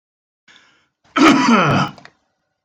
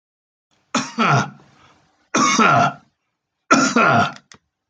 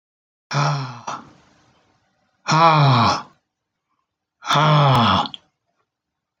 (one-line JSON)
{"cough_length": "2.6 s", "cough_amplitude": 28681, "cough_signal_mean_std_ratio": 0.45, "three_cough_length": "4.7 s", "three_cough_amplitude": 30382, "three_cough_signal_mean_std_ratio": 0.49, "exhalation_length": "6.4 s", "exhalation_amplitude": 24208, "exhalation_signal_mean_std_ratio": 0.47, "survey_phase": "beta (2021-08-13 to 2022-03-07)", "age": "65+", "gender": "Male", "wearing_mask": "No", "symptom_none": true, "smoker_status": "Ex-smoker", "respiratory_condition_asthma": false, "respiratory_condition_other": false, "recruitment_source": "REACT", "submission_delay": "2 days", "covid_test_result": "Negative", "covid_test_method": "RT-qPCR"}